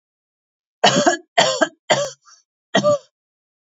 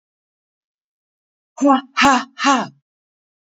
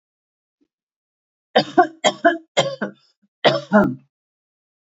{
  "cough_length": "3.7 s",
  "cough_amplitude": 29021,
  "cough_signal_mean_std_ratio": 0.41,
  "exhalation_length": "3.5 s",
  "exhalation_amplitude": 27316,
  "exhalation_signal_mean_std_ratio": 0.35,
  "three_cough_length": "4.9 s",
  "three_cough_amplitude": 28144,
  "three_cough_signal_mean_std_ratio": 0.33,
  "survey_phase": "beta (2021-08-13 to 2022-03-07)",
  "age": "45-64",
  "gender": "Female",
  "wearing_mask": "No",
  "symptom_none": true,
  "smoker_status": "Ex-smoker",
  "respiratory_condition_asthma": false,
  "respiratory_condition_other": false,
  "recruitment_source": "REACT",
  "submission_delay": "2 days",
  "covid_test_result": "Negative",
  "covid_test_method": "RT-qPCR",
  "influenza_a_test_result": "Negative",
  "influenza_b_test_result": "Negative"
}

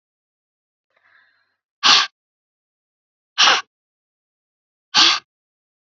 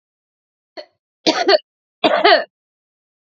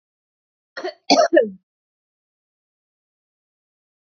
{
  "exhalation_length": "6.0 s",
  "exhalation_amplitude": 32768,
  "exhalation_signal_mean_std_ratio": 0.26,
  "three_cough_length": "3.2 s",
  "three_cough_amplitude": 30204,
  "three_cough_signal_mean_std_ratio": 0.35,
  "cough_length": "4.0 s",
  "cough_amplitude": 27355,
  "cough_signal_mean_std_ratio": 0.24,
  "survey_phase": "alpha (2021-03-01 to 2021-08-12)",
  "age": "18-44",
  "gender": "Female",
  "wearing_mask": "No",
  "symptom_cough_any": true,
  "symptom_fatigue": true,
  "symptom_fever_high_temperature": true,
  "symptom_headache": true,
  "symptom_change_to_sense_of_smell_or_taste": true,
  "symptom_loss_of_taste": true,
  "symptom_onset": "5 days",
  "smoker_status": "Current smoker (1 to 10 cigarettes per day)",
  "respiratory_condition_asthma": false,
  "respiratory_condition_other": false,
  "recruitment_source": "Test and Trace",
  "submission_delay": "2 days",
  "covid_test_result": "Positive",
  "covid_test_method": "RT-qPCR",
  "covid_ct_value": 22.9,
  "covid_ct_gene": "N gene",
  "covid_ct_mean": 23.1,
  "covid_viral_load": "27000 copies/ml",
  "covid_viral_load_category": "Low viral load (10K-1M copies/ml)"
}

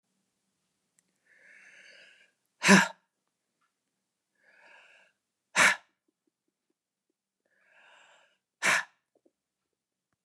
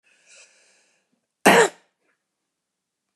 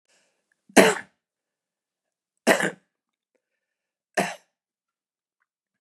{
  "exhalation_length": "10.2 s",
  "exhalation_amplitude": 16759,
  "exhalation_signal_mean_std_ratio": 0.19,
  "cough_length": "3.2 s",
  "cough_amplitude": 32128,
  "cough_signal_mean_std_ratio": 0.21,
  "three_cough_length": "5.8 s",
  "three_cough_amplitude": 32752,
  "three_cough_signal_mean_std_ratio": 0.21,
  "survey_phase": "beta (2021-08-13 to 2022-03-07)",
  "age": "45-64",
  "gender": "Male",
  "wearing_mask": "No",
  "symptom_none": true,
  "symptom_onset": "11 days",
  "smoker_status": "Prefer not to say",
  "respiratory_condition_asthma": false,
  "respiratory_condition_other": false,
  "recruitment_source": "REACT",
  "submission_delay": "1 day",
  "covid_test_result": "Negative",
  "covid_test_method": "RT-qPCR",
  "influenza_a_test_result": "Negative",
  "influenza_b_test_result": "Negative"
}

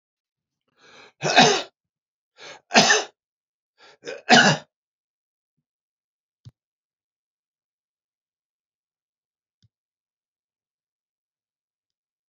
{
  "three_cough_length": "12.3 s",
  "three_cough_amplitude": 29407,
  "three_cough_signal_mean_std_ratio": 0.21,
  "survey_phase": "beta (2021-08-13 to 2022-03-07)",
  "age": "65+",
  "gender": "Male",
  "wearing_mask": "No",
  "symptom_sore_throat": true,
  "smoker_status": "Ex-smoker",
  "respiratory_condition_asthma": false,
  "respiratory_condition_other": false,
  "recruitment_source": "REACT",
  "submission_delay": "3 days",
  "covid_test_result": "Negative",
  "covid_test_method": "RT-qPCR",
  "influenza_a_test_result": "Negative",
  "influenza_b_test_result": "Negative"
}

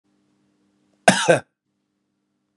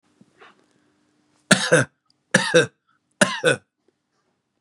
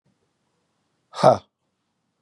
{
  "cough_length": "2.6 s",
  "cough_amplitude": 32768,
  "cough_signal_mean_std_ratio": 0.23,
  "three_cough_length": "4.6 s",
  "three_cough_amplitude": 32768,
  "three_cough_signal_mean_std_ratio": 0.31,
  "exhalation_length": "2.2 s",
  "exhalation_amplitude": 26649,
  "exhalation_signal_mean_std_ratio": 0.2,
  "survey_phase": "beta (2021-08-13 to 2022-03-07)",
  "age": "45-64",
  "gender": "Male",
  "wearing_mask": "No",
  "symptom_none": true,
  "smoker_status": "Never smoked",
  "respiratory_condition_asthma": false,
  "respiratory_condition_other": false,
  "recruitment_source": "REACT",
  "submission_delay": "1 day",
  "covid_test_result": "Negative",
  "covid_test_method": "RT-qPCR",
  "influenza_a_test_result": "Negative",
  "influenza_b_test_result": "Negative"
}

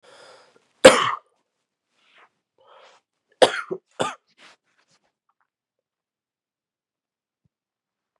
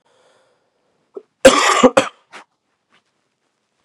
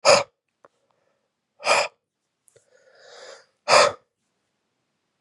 {
  "three_cough_length": "8.2 s",
  "three_cough_amplitude": 32768,
  "three_cough_signal_mean_std_ratio": 0.16,
  "cough_length": "3.8 s",
  "cough_amplitude": 32768,
  "cough_signal_mean_std_ratio": 0.27,
  "exhalation_length": "5.2 s",
  "exhalation_amplitude": 26701,
  "exhalation_signal_mean_std_ratio": 0.27,
  "survey_phase": "beta (2021-08-13 to 2022-03-07)",
  "age": "18-44",
  "gender": "Male",
  "wearing_mask": "No",
  "symptom_cough_any": true,
  "symptom_new_continuous_cough": true,
  "symptom_runny_or_blocked_nose": true,
  "symptom_shortness_of_breath": true,
  "symptom_sore_throat": true,
  "symptom_fatigue": true,
  "symptom_headache": true,
  "symptom_change_to_sense_of_smell_or_taste": true,
  "symptom_loss_of_taste": true,
  "symptom_onset": "3 days",
  "smoker_status": "Never smoked",
  "respiratory_condition_asthma": false,
  "respiratory_condition_other": false,
  "recruitment_source": "Test and Trace",
  "submission_delay": "2 days",
  "covid_test_result": "Positive",
  "covid_test_method": "RT-qPCR",
  "covid_ct_value": 23.0,
  "covid_ct_gene": "ORF1ab gene",
  "covid_ct_mean": 23.1,
  "covid_viral_load": "26000 copies/ml",
  "covid_viral_load_category": "Low viral load (10K-1M copies/ml)"
}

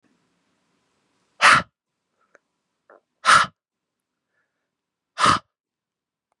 {
  "exhalation_length": "6.4 s",
  "exhalation_amplitude": 30880,
  "exhalation_signal_mean_std_ratio": 0.23,
  "survey_phase": "beta (2021-08-13 to 2022-03-07)",
  "age": "18-44",
  "gender": "Female",
  "wearing_mask": "No",
  "symptom_cough_any": true,
  "symptom_onset": "9 days",
  "smoker_status": "Ex-smoker",
  "respiratory_condition_asthma": false,
  "respiratory_condition_other": false,
  "recruitment_source": "REACT",
  "submission_delay": "3 days",
  "covid_test_result": "Negative",
  "covid_test_method": "RT-qPCR",
  "influenza_a_test_result": "Unknown/Void",
  "influenza_b_test_result": "Unknown/Void"
}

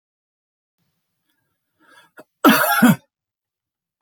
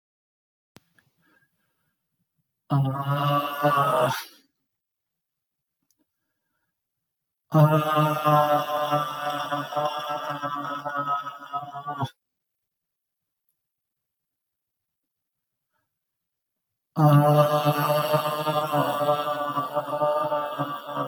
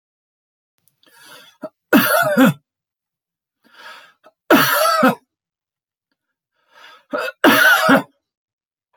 {
  "cough_length": "4.0 s",
  "cough_amplitude": 30015,
  "cough_signal_mean_std_ratio": 0.28,
  "exhalation_length": "21.1 s",
  "exhalation_amplitude": 14532,
  "exhalation_signal_mean_std_ratio": 0.53,
  "three_cough_length": "9.0 s",
  "three_cough_amplitude": 29885,
  "three_cough_signal_mean_std_ratio": 0.39,
  "survey_phase": "beta (2021-08-13 to 2022-03-07)",
  "age": "45-64",
  "gender": "Male",
  "wearing_mask": "No",
  "symptom_none": true,
  "smoker_status": "Never smoked",
  "respiratory_condition_asthma": false,
  "respiratory_condition_other": false,
  "recruitment_source": "REACT",
  "submission_delay": "2 days",
  "covid_test_result": "Negative",
  "covid_test_method": "RT-qPCR",
  "influenza_a_test_result": "Negative",
  "influenza_b_test_result": "Negative"
}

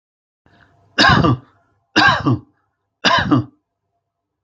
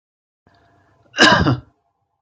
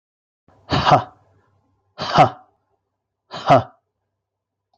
{
  "three_cough_length": "4.4 s",
  "three_cough_amplitude": 30847,
  "three_cough_signal_mean_std_ratio": 0.42,
  "cough_length": "2.2 s",
  "cough_amplitude": 31566,
  "cough_signal_mean_std_ratio": 0.33,
  "exhalation_length": "4.8 s",
  "exhalation_amplitude": 29196,
  "exhalation_signal_mean_std_ratio": 0.29,
  "survey_phase": "beta (2021-08-13 to 2022-03-07)",
  "age": "45-64",
  "gender": "Male",
  "wearing_mask": "No",
  "symptom_none": true,
  "smoker_status": "Never smoked",
  "respiratory_condition_asthma": false,
  "respiratory_condition_other": false,
  "recruitment_source": "REACT",
  "submission_delay": "11 days",
  "covid_test_result": "Negative",
  "covid_test_method": "RT-qPCR"
}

